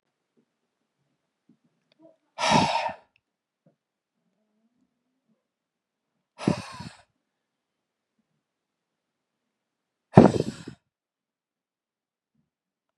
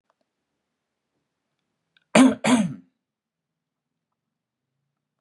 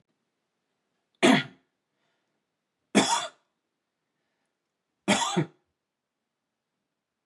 exhalation_length: 13.0 s
exhalation_amplitude: 32768
exhalation_signal_mean_std_ratio: 0.17
cough_length: 5.2 s
cough_amplitude: 30653
cough_signal_mean_std_ratio: 0.23
three_cough_length: 7.3 s
three_cough_amplitude: 16467
three_cough_signal_mean_std_ratio: 0.25
survey_phase: beta (2021-08-13 to 2022-03-07)
age: 18-44
gender: Male
wearing_mask: 'No'
symptom_none: true
smoker_status: Never smoked
respiratory_condition_asthma: false
respiratory_condition_other: false
recruitment_source: Test and Trace
submission_delay: 0 days
covid_test_result: Positive
covid_test_method: LFT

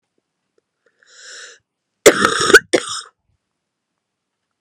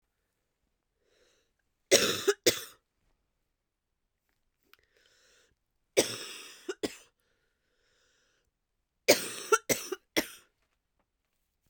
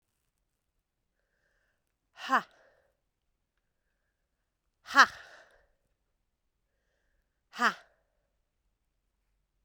cough_length: 4.6 s
cough_amplitude: 32768
cough_signal_mean_std_ratio: 0.25
three_cough_length: 11.7 s
three_cough_amplitude: 21193
three_cough_signal_mean_std_ratio: 0.23
exhalation_length: 9.6 s
exhalation_amplitude: 15622
exhalation_signal_mean_std_ratio: 0.14
survey_phase: beta (2021-08-13 to 2022-03-07)
age: 18-44
gender: Female
wearing_mask: 'No'
symptom_cough_any: true
symptom_runny_or_blocked_nose: true
symptom_sore_throat: true
symptom_fatigue: true
symptom_headache: true
symptom_onset: 6 days
smoker_status: Ex-smoker
respiratory_condition_asthma: false
respiratory_condition_other: false
recruitment_source: Test and Trace
submission_delay: 2 days
covid_test_result: Positive
covid_test_method: RT-qPCR
covid_ct_value: 29.4
covid_ct_gene: N gene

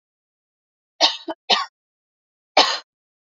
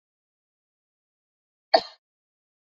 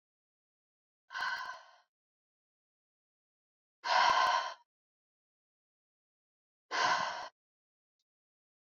three_cough_length: 3.3 s
three_cough_amplitude: 32767
three_cough_signal_mean_std_ratio: 0.28
cough_length: 2.6 s
cough_amplitude: 24902
cough_signal_mean_std_ratio: 0.11
exhalation_length: 8.7 s
exhalation_amplitude: 5900
exhalation_signal_mean_std_ratio: 0.32
survey_phase: beta (2021-08-13 to 2022-03-07)
age: 18-44
gender: Female
wearing_mask: 'No'
symptom_cough_any: true
symptom_runny_or_blocked_nose: true
symptom_fatigue: true
symptom_onset: 5 days
smoker_status: Never smoked
respiratory_condition_asthma: false
respiratory_condition_other: false
recruitment_source: Test and Trace
submission_delay: 2 days
covid_test_result: Positive
covid_test_method: RT-qPCR
covid_ct_value: 20.2
covid_ct_gene: ORF1ab gene
covid_ct_mean: 20.7
covid_viral_load: 160000 copies/ml
covid_viral_load_category: Low viral load (10K-1M copies/ml)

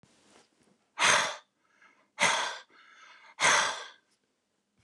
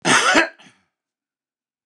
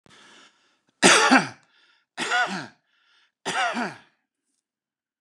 exhalation_length: 4.8 s
exhalation_amplitude: 13261
exhalation_signal_mean_std_ratio: 0.38
cough_length: 1.9 s
cough_amplitude: 29203
cough_signal_mean_std_ratio: 0.39
three_cough_length: 5.2 s
three_cough_amplitude: 28762
three_cough_signal_mean_std_ratio: 0.34
survey_phase: beta (2021-08-13 to 2022-03-07)
age: 65+
gender: Male
wearing_mask: 'No'
symptom_none: true
symptom_onset: 12 days
smoker_status: Ex-smoker
respiratory_condition_asthma: false
respiratory_condition_other: false
recruitment_source: REACT
submission_delay: 5 days
covid_test_result: Negative
covid_test_method: RT-qPCR
influenza_a_test_result: Negative
influenza_b_test_result: Negative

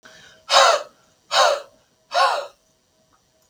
exhalation_length: 3.5 s
exhalation_amplitude: 32768
exhalation_signal_mean_std_ratio: 0.41
survey_phase: beta (2021-08-13 to 2022-03-07)
age: 45-64
gender: Male
wearing_mask: 'No'
symptom_none: true
smoker_status: Ex-smoker
respiratory_condition_asthma: false
respiratory_condition_other: false
recruitment_source: REACT
submission_delay: 5 days
covid_test_result: Negative
covid_test_method: RT-qPCR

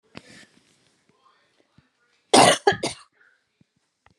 cough_length: 4.2 s
cough_amplitude: 28514
cough_signal_mean_std_ratio: 0.23
survey_phase: beta (2021-08-13 to 2022-03-07)
age: 45-64
gender: Female
wearing_mask: 'No'
symptom_none: true
smoker_status: Never smoked
respiratory_condition_asthma: false
respiratory_condition_other: false
recruitment_source: REACT
submission_delay: 1 day
covid_test_result: Negative
covid_test_method: RT-qPCR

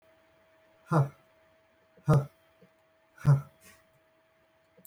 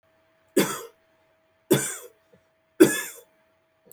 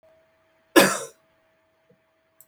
exhalation_length: 4.9 s
exhalation_amplitude: 7383
exhalation_signal_mean_std_ratio: 0.27
three_cough_length: 3.9 s
three_cough_amplitude: 25892
three_cough_signal_mean_std_ratio: 0.27
cough_length: 2.5 s
cough_amplitude: 30349
cough_signal_mean_std_ratio: 0.22
survey_phase: beta (2021-08-13 to 2022-03-07)
age: 45-64
gender: Male
wearing_mask: 'No'
symptom_none: true
smoker_status: Never smoked
respiratory_condition_asthma: false
respiratory_condition_other: false
recruitment_source: REACT
submission_delay: 1 day
covid_test_result: Negative
covid_test_method: RT-qPCR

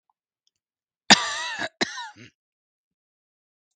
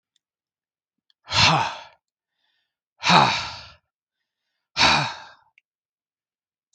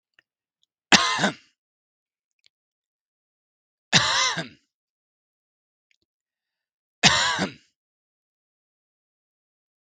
cough_length: 3.8 s
cough_amplitude: 32768
cough_signal_mean_std_ratio: 0.22
exhalation_length: 6.7 s
exhalation_amplitude: 30428
exhalation_signal_mean_std_ratio: 0.32
three_cough_length: 9.8 s
three_cough_amplitude: 32768
three_cough_signal_mean_std_ratio: 0.26
survey_phase: beta (2021-08-13 to 2022-03-07)
age: 45-64
gender: Male
wearing_mask: 'No'
symptom_none: true
smoker_status: Never smoked
respiratory_condition_asthma: false
respiratory_condition_other: false
recruitment_source: REACT
submission_delay: 2 days
covid_test_result: Negative
covid_test_method: RT-qPCR
influenza_a_test_result: Negative
influenza_b_test_result: Negative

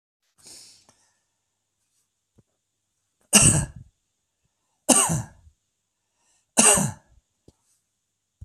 three_cough_length: 8.4 s
three_cough_amplitude: 32767
three_cough_signal_mean_std_ratio: 0.26
survey_phase: beta (2021-08-13 to 2022-03-07)
age: 45-64
gender: Male
wearing_mask: 'No'
symptom_none: true
smoker_status: Never smoked
respiratory_condition_asthma: false
respiratory_condition_other: false
recruitment_source: REACT
submission_delay: 1 day
covid_test_result: Negative
covid_test_method: RT-qPCR
influenza_a_test_result: Negative
influenza_b_test_result: Negative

